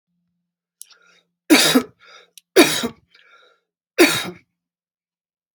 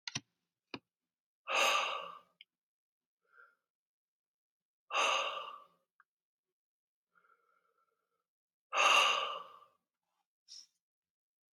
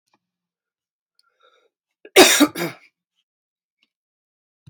{"three_cough_length": "5.5 s", "three_cough_amplitude": 32767, "three_cough_signal_mean_std_ratio": 0.3, "exhalation_length": "11.5 s", "exhalation_amplitude": 5569, "exhalation_signal_mean_std_ratio": 0.31, "cough_length": "4.7 s", "cough_amplitude": 31107, "cough_signal_mean_std_ratio": 0.21, "survey_phase": "beta (2021-08-13 to 2022-03-07)", "age": "45-64", "gender": "Male", "wearing_mask": "No", "symptom_none": true, "smoker_status": "Current smoker (1 to 10 cigarettes per day)", "respiratory_condition_asthma": true, "respiratory_condition_other": false, "recruitment_source": "REACT", "submission_delay": "0 days", "covid_test_result": "Negative", "covid_test_method": "RT-qPCR"}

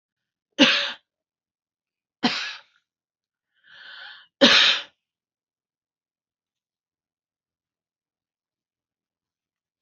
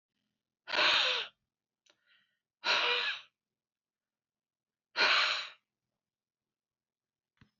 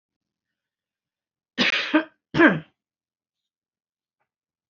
{"three_cough_length": "9.8 s", "three_cough_amplitude": 29360, "three_cough_signal_mean_std_ratio": 0.23, "exhalation_length": "7.6 s", "exhalation_amplitude": 6106, "exhalation_signal_mean_std_ratio": 0.36, "cough_length": "4.7 s", "cough_amplitude": 23341, "cough_signal_mean_std_ratio": 0.27, "survey_phase": "beta (2021-08-13 to 2022-03-07)", "age": "45-64", "gender": "Female", "wearing_mask": "No", "symptom_runny_or_blocked_nose": true, "symptom_onset": "12 days", "smoker_status": "Ex-smoker", "respiratory_condition_asthma": true, "respiratory_condition_other": false, "recruitment_source": "REACT", "submission_delay": "2 days", "covid_test_result": "Negative", "covid_test_method": "RT-qPCR", "influenza_a_test_result": "Negative", "influenza_b_test_result": "Negative"}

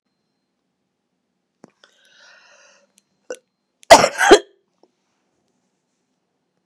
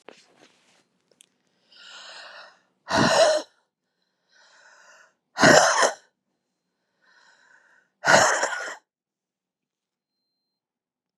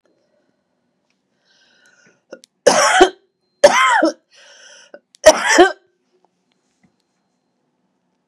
{"cough_length": "6.7 s", "cough_amplitude": 32768, "cough_signal_mean_std_ratio": 0.17, "exhalation_length": "11.2 s", "exhalation_amplitude": 29853, "exhalation_signal_mean_std_ratio": 0.3, "three_cough_length": "8.3 s", "three_cough_amplitude": 32768, "three_cough_signal_mean_std_ratio": 0.3, "survey_phase": "beta (2021-08-13 to 2022-03-07)", "age": "45-64", "gender": "Female", "wearing_mask": "No", "symptom_cough_any": true, "symptom_runny_or_blocked_nose": true, "symptom_fatigue": true, "symptom_loss_of_taste": true, "symptom_onset": "4 days", "smoker_status": "Ex-smoker", "respiratory_condition_asthma": false, "respiratory_condition_other": false, "recruitment_source": "Test and Trace", "submission_delay": "3 days", "covid_test_result": "Negative", "covid_test_method": "RT-qPCR"}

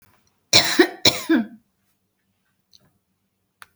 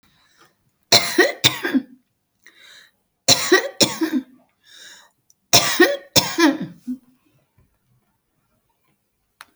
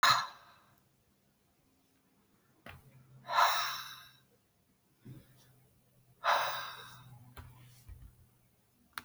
{"cough_length": "3.8 s", "cough_amplitude": 32768, "cough_signal_mean_std_ratio": 0.3, "three_cough_length": "9.6 s", "three_cough_amplitude": 32768, "three_cough_signal_mean_std_ratio": 0.35, "exhalation_length": "9.0 s", "exhalation_amplitude": 7304, "exhalation_signal_mean_std_ratio": 0.32, "survey_phase": "alpha (2021-03-01 to 2021-08-12)", "age": "65+", "gender": "Female", "wearing_mask": "No", "symptom_none": true, "smoker_status": "Ex-smoker", "respiratory_condition_asthma": true, "respiratory_condition_other": false, "recruitment_source": "REACT", "submission_delay": "2 days", "covid_test_result": "Negative", "covid_test_method": "RT-qPCR"}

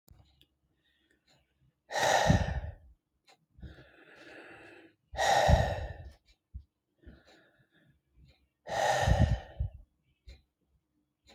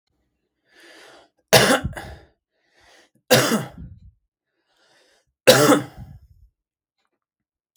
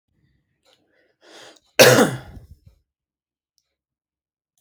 {"exhalation_length": "11.3 s", "exhalation_amplitude": 10234, "exhalation_signal_mean_std_ratio": 0.37, "three_cough_length": "7.8 s", "three_cough_amplitude": 32767, "three_cough_signal_mean_std_ratio": 0.29, "cough_length": "4.6 s", "cough_amplitude": 32768, "cough_signal_mean_std_ratio": 0.22, "survey_phase": "beta (2021-08-13 to 2022-03-07)", "age": "18-44", "gender": "Male", "wearing_mask": "No", "symptom_none": true, "smoker_status": "Never smoked", "respiratory_condition_asthma": false, "respiratory_condition_other": false, "recruitment_source": "REACT", "submission_delay": "1 day", "covid_test_result": "Negative", "covid_test_method": "RT-qPCR"}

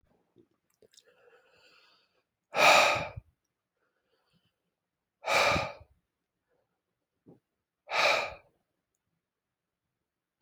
{"exhalation_length": "10.4 s", "exhalation_amplitude": 13847, "exhalation_signal_mean_std_ratio": 0.27, "survey_phase": "alpha (2021-03-01 to 2021-08-12)", "age": "65+", "gender": "Male", "wearing_mask": "No", "symptom_abdominal_pain": true, "symptom_onset": "8 days", "smoker_status": "Ex-smoker", "respiratory_condition_asthma": false, "respiratory_condition_other": false, "recruitment_source": "REACT", "submission_delay": "1 day", "covid_test_result": "Negative", "covid_test_method": "RT-qPCR"}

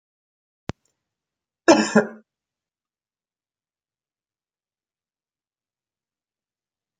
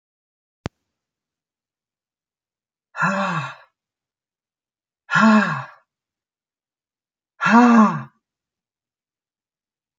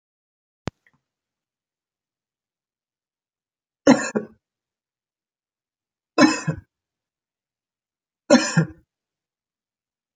{"cough_length": "7.0 s", "cough_amplitude": 29835, "cough_signal_mean_std_ratio": 0.15, "exhalation_length": "10.0 s", "exhalation_amplitude": 24908, "exhalation_signal_mean_std_ratio": 0.3, "three_cough_length": "10.2 s", "three_cough_amplitude": 28696, "three_cough_signal_mean_std_ratio": 0.2, "survey_phase": "alpha (2021-03-01 to 2021-08-12)", "age": "65+", "gender": "Female", "wearing_mask": "No", "symptom_none": true, "symptom_onset": "12 days", "smoker_status": "Ex-smoker", "respiratory_condition_asthma": false, "respiratory_condition_other": false, "recruitment_source": "REACT", "submission_delay": "2 days", "covid_test_result": "Negative", "covid_test_method": "RT-qPCR"}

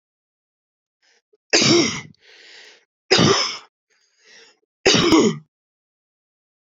{"three_cough_length": "6.7 s", "three_cough_amplitude": 29961, "three_cough_signal_mean_std_ratio": 0.37, "survey_phase": "beta (2021-08-13 to 2022-03-07)", "age": "45-64", "gender": "Female", "wearing_mask": "No", "symptom_change_to_sense_of_smell_or_taste": true, "symptom_onset": "5 days", "smoker_status": "Ex-smoker", "respiratory_condition_asthma": false, "respiratory_condition_other": false, "recruitment_source": "Test and Trace", "submission_delay": "2 days", "covid_test_result": "Positive", "covid_test_method": "RT-qPCR", "covid_ct_value": 21.4, "covid_ct_gene": "ORF1ab gene", "covid_ct_mean": 22.0, "covid_viral_load": "62000 copies/ml", "covid_viral_load_category": "Low viral load (10K-1M copies/ml)"}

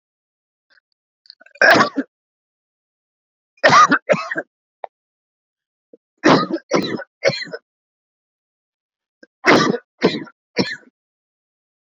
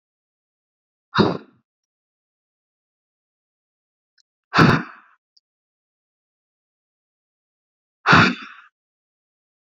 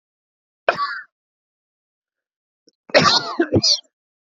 {"three_cough_length": "11.9 s", "three_cough_amplitude": 32768, "three_cough_signal_mean_std_ratio": 0.32, "exhalation_length": "9.6 s", "exhalation_amplitude": 28223, "exhalation_signal_mean_std_ratio": 0.21, "cough_length": "4.4 s", "cough_amplitude": 28954, "cough_signal_mean_std_ratio": 0.35, "survey_phase": "beta (2021-08-13 to 2022-03-07)", "age": "45-64", "gender": "Male", "wearing_mask": "No", "symptom_cough_any": true, "symptom_runny_or_blocked_nose": true, "symptom_sore_throat": true, "symptom_headache": true, "smoker_status": "Never smoked", "respiratory_condition_asthma": false, "respiratory_condition_other": false, "recruitment_source": "Test and Trace", "submission_delay": "2 days", "covid_test_result": "Positive", "covid_test_method": "RT-qPCR", "covid_ct_value": 25.8, "covid_ct_gene": "N gene"}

